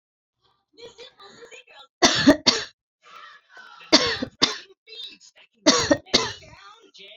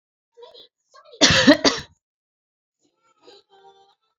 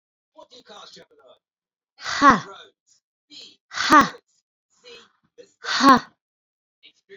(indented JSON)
{
  "three_cough_length": "7.2 s",
  "three_cough_amplitude": 31325,
  "three_cough_signal_mean_std_ratio": 0.33,
  "cough_length": "4.2 s",
  "cough_amplitude": 30106,
  "cough_signal_mean_std_ratio": 0.26,
  "exhalation_length": "7.2 s",
  "exhalation_amplitude": 27695,
  "exhalation_signal_mean_std_ratio": 0.27,
  "survey_phase": "beta (2021-08-13 to 2022-03-07)",
  "age": "45-64",
  "gender": "Female",
  "wearing_mask": "No",
  "symptom_none": true,
  "symptom_onset": "13 days",
  "smoker_status": "Never smoked",
  "respiratory_condition_asthma": false,
  "respiratory_condition_other": false,
  "recruitment_source": "REACT",
  "submission_delay": "1 day",
  "covid_test_result": "Negative",
  "covid_test_method": "RT-qPCR"
}